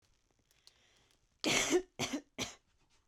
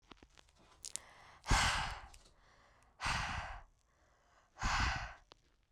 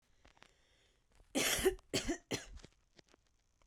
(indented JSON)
{
  "cough_length": "3.1 s",
  "cough_amplitude": 6926,
  "cough_signal_mean_std_ratio": 0.37,
  "exhalation_length": "5.7 s",
  "exhalation_amplitude": 5195,
  "exhalation_signal_mean_std_ratio": 0.43,
  "three_cough_length": "3.7 s",
  "three_cough_amplitude": 4488,
  "three_cough_signal_mean_std_ratio": 0.37,
  "survey_phase": "beta (2021-08-13 to 2022-03-07)",
  "age": "18-44",
  "gender": "Female",
  "wearing_mask": "No",
  "symptom_runny_or_blocked_nose": true,
  "smoker_status": "Never smoked",
  "respiratory_condition_asthma": true,
  "respiratory_condition_other": false,
  "recruitment_source": "REACT",
  "submission_delay": "3 days",
  "covid_test_result": "Negative",
  "covid_test_method": "RT-qPCR"
}